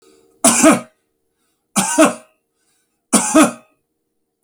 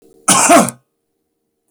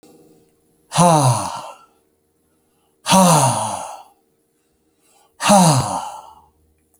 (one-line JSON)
{"three_cough_length": "4.4 s", "three_cough_amplitude": 32768, "three_cough_signal_mean_std_ratio": 0.38, "cough_length": "1.7 s", "cough_amplitude": 32768, "cough_signal_mean_std_ratio": 0.41, "exhalation_length": "7.0 s", "exhalation_amplitude": 30524, "exhalation_signal_mean_std_ratio": 0.43, "survey_phase": "beta (2021-08-13 to 2022-03-07)", "age": "45-64", "gender": "Male", "wearing_mask": "No", "symptom_headache": true, "symptom_onset": "2 days", "smoker_status": "Ex-smoker", "respiratory_condition_asthma": false, "respiratory_condition_other": false, "recruitment_source": "Test and Trace", "submission_delay": "1 day", "covid_test_result": "Positive", "covid_test_method": "RT-qPCR", "covid_ct_value": 20.9, "covid_ct_gene": "N gene"}